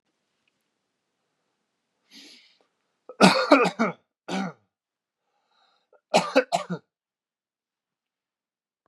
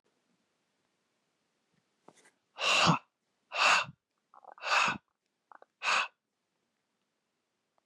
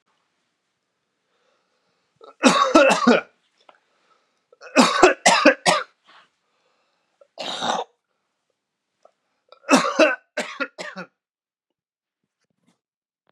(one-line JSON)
{"cough_length": "8.9 s", "cough_amplitude": 30695, "cough_signal_mean_std_ratio": 0.25, "exhalation_length": "7.9 s", "exhalation_amplitude": 7508, "exhalation_signal_mean_std_ratio": 0.32, "three_cough_length": "13.3 s", "three_cough_amplitude": 32767, "three_cough_signal_mean_std_ratio": 0.32, "survey_phase": "beta (2021-08-13 to 2022-03-07)", "age": "18-44", "gender": "Male", "wearing_mask": "No", "symptom_cough_any": true, "symptom_shortness_of_breath": true, "symptom_fatigue": true, "symptom_change_to_sense_of_smell_or_taste": true, "smoker_status": "Never smoked", "respiratory_condition_asthma": false, "respiratory_condition_other": false, "recruitment_source": "Test and Trace", "submission_delay": "2 days", "covid_test_result": "Positive", "covid_test_method": "RT-qPCR", "covid_ct_value": 17.4, "covid_ct_gene": "ORF1ab gene", "covid_ct_mean": 18.7, "covid_viral_load": "740000 copies/ml", "covid_viral_load_category": "Low viral load (10K-1M copies/ml)"}